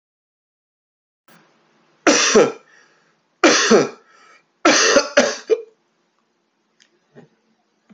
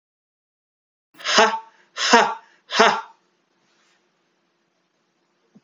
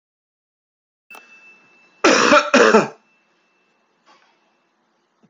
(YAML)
three_cough_length: 7.9 s
three_cough_amplitude: 30444
three_cough_signal_mean_std_ratio: 0.36
exhalation_length: 5.6 s
exhalation_amplitude: 29734
exhalation_signal_mean_std_ratio: 0.29
cough_length: 5.3 s
cough_amplitude: 30181
cough_signal_mean_std_ratio: 0.3
survey_phase: alpha (2021-03-01 to 2021-08-12)
age: 18-44
gender: Male
wearing_mask: 'No'
symptom_none: true
smoker_status: Ex-smoker
respiratory_condition_asthma: false
respiratory_condition_other: false
recruitment_source: REACT
submission_delay: 2 days
covid_test_result: Negative
covid_test_method: RT-qPCR